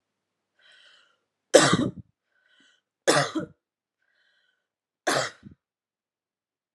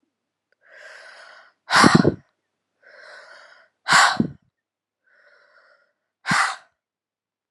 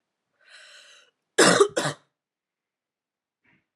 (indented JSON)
{
  "three_cough_length": "6.7 s",
  "three_cough_amplitude": 31086,
  "three_cough_signal_mean_std_ratio": 0.25,
  "exhalation_length": "7.5 s",
  "exhalation_amplitude": 32721,
  "exhalation_signal_mean_std_ratio": 0.28,
  "cough_length": "3.8 s",
  "cough_amplitude": 24839,
  "cough_signal_mean_std_ratio": 0.26,
  "survey_phase": "beta (2021-08-13 to 2022-03-07)",
  "age": "18-44",
  "gender": "Female",
  "wearing_mask": "No",
  "symptom_new_continuous_cough": true,
  "symptom_runny_or_blocked_nose": true,
  "symptom_shortness_of_breath": true,
  "symptom_fatigue": true,
  "symptom_headache": true,
  "symptom_change_to_sense_of_smell_or_taste": true,
  "symptom_onset": "74 days",
  "smoker_status": "Never smoked",
  "respiratory_condition_asthma": false,
  "respiratory_condition_other": false,
  "recruitment_source": "Test and Trace",
  "submission_delay": "2 days",
  "covid_test_result": "Positive",
  "covid_test_method": "ePCR"
}